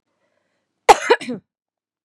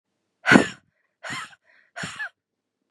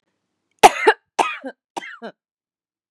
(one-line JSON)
{"cough_length": "2.0 s", "cough_amplitude": 32768, "cough_signal_mean_std_ratio": 0.23, "exhalation_length": "2.9 s", "exhalation_amplitude": 32767, "exhalation_signal_mean_std_ratio": 0.25, "three_cough_length": "2.9 s", "three_cough_amplitude": 32768, "three_cough_signal_mean_std_ratio": 0.24, "survey_phase": "beta (2021-08-13 to 2022-03-07)", "age": "18-44", "gender": "Female", "wearing_mask": "No", "symptom_none": true, "smoker_status": "Never smoked", "respiratory_condition_asthma": false, "respiratory_condition_other": false, "recruitment_source": "REACT", "submission_delay": "2 days", "covid_test_result": "Negative", "covid_test_method": "RT-qPCR", "influenza_a_test_result": "Negative", "influenza_b_test_result": "Negative"}